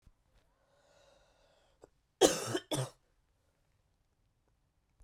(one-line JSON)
{"cough_length": "5.0 s", "cough_amplitude": 10895, "cough_signal_mean_std_ratio": 0.21, "survey_phase": "beta (2021-08-13 to 2022-03-07)", "age": "18-44", "gender": "Female", "wearing_mask": "No", "symptom_cough_any": true, "symptom_new_continuous_cough": true, "symptom_change_to_sense_of_smell_or_taste": true, "symptom_loss_of_taste": true, "smoker_status": "Never smoked", "respiratory_condition_asthma": false, "respiratory_condition_other": false, "recruitment_source": "Test and Trace", "submission_delay": "2 days", "covid_test_result": "Positive", "covid_test_method": "LFT"}